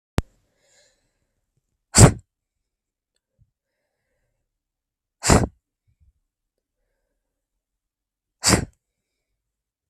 exhalation_length: 9.9 s
exhalation_amplitude: 32768
exhalation_signal_mean_std_ratio: 0.17
survey_phase: beta (2021-08-13 to 2022-03-07)
age: 18-44
gender: Female
wearing_mask: 'No'
symptom_none: true
smoker_status: Never smoked
respiratory_condition_asthma: false
respiratory_condition_other: false
recruitment_source: REACT
submission_delay: 1 day
covid_test_result: Negative
covid_test_method: RT-qPCR
influenza_a_test_result: Negative
influenza_b_test_result: Negative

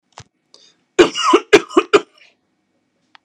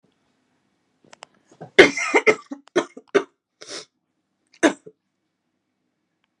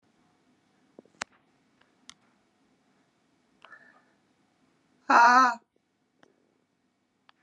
three_cough_length: 3.2 s
three_cough_amplitude: 32768
three_cough_signal_mean_std_ratio: 0.3
cough_length: 6.4 s
cough_amplitude: 32768
cough_signal_mean_std_ratio: 0.23
exhalation_length: 7.4 s
exhalation_amplitude: 15592
exhalation_signal_mean_std_ratio: 0.2
survey_phase: beta (2021-08-13 to 2022-03-07)
age: 45-64
gender: Female
wearing_mask: 'No'
symptom_cough_any: true
symptom_runny_or_blocked_nose: true
symptom_sore_throat: true
symptom_diarrhoea: true
symptom_headache: true
symptom_change_to_sense_of_smell_or_taste: true
symptom_onset: 3 days
smoker_status: Current smoker (1 to 10 cigarettes per day)
respiratory_condition_asthma: false
respiratory_condition_other: false
recruitment_source: Test and Trace
submission_delay: 1 day
covid_test_result: Positive
covid_test_method: RT-qPCR
covid_ct_value: 21.5
covid_ct_gene: S gene
covid_ct_mean: 22.1
covid_viral_load: 57000 copies/ml
covid_viral_load_category: Low viral load (10K-1M copies/ml)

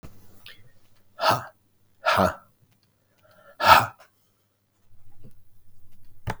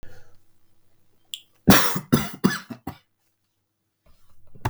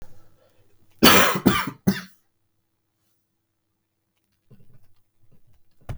exhalation_length: 6.4 s
exhalation_amplitude: 32768
exhalation_signal_mean_std_ratio: 0.32
three_cough_length: 4.7 s
three_cough_amplitude: 32766
three_cough_signal_mean_std_ratio: 0.31
cough_length: 6.0 s
cough_amplitude: 32768
cough_signal_mean_std_ratio: 0.27
survey_phase: beta (2021-08-13 to 2022-03-07)
age: 18-44
gender: Male
wearing_mask: 'No'
symptom_cough_any: true
smoker_status: Ex-smoker
respiratory_condition_asthma: false
respiratory_condition_other: false
recruitment_source: REACT
submission_delay: 1 day
covid_test_result: Positive
covid_test_method: RT-qPCR
covid_ct_value: 18.0
covid_ct_gene: E gene
influenza_a_test_result: Unknown/Void
influenza_b_test_result: Unknown/Void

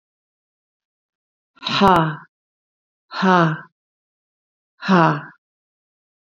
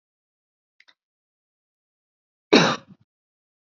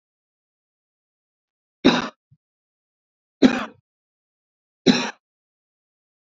exhalation_length: 6.2 s
exhalation_amplitude: 27960
exhalation_signal_mean_std_ratio: 0.33
cough_length: 3.8 s
cough_amplitude: 28071
cough_signal_mean_std_ratio: 0.18
three_cough_length: 6.3 s
three_cough_amplitude: 27510
three_cough_signal_mean_std_ratio: 0.21
survey_phase: beta (2021-08-13 to 2022-03-07)
age: 65+
gender: Female
wearing_mask: 'No'
symptom_cough_any: true
symptom_runny_or_blocked_nose: true
symptom_onset: 3 days
smoker_status: Ex-smoker
respiratory_condition_asthma: false
respiratory_condition_other: false
recruitment_source: Test and Trace
submission_delay: 1 day
covid_test_result: Negative
covid_test_method: RT-qPCR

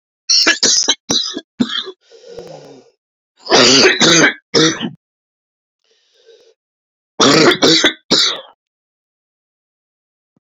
three_cough_length: 10.4 s
three_cough_amplitude: 32767
three_cough_signal_mean_std_ratio: 0.46
survey_phase: alpha (2021-03-01 to 2021-08-12)
age: 45-64
gender: Male
wearing_mask: 'No'
symptom_cough_any: true
symptom_shortness_of_breath: true
symptom_fatigue: true
symptom_headache: true
symptom_onset: 5 days
smoker_status: Ex-smoker
respiratory_condition_asthma: false
respiratory_condition_other: false
recruitment_source: Test and Trace
submission_delay: 2 days
covid_test_result: Positive
covid_test_method: ePCR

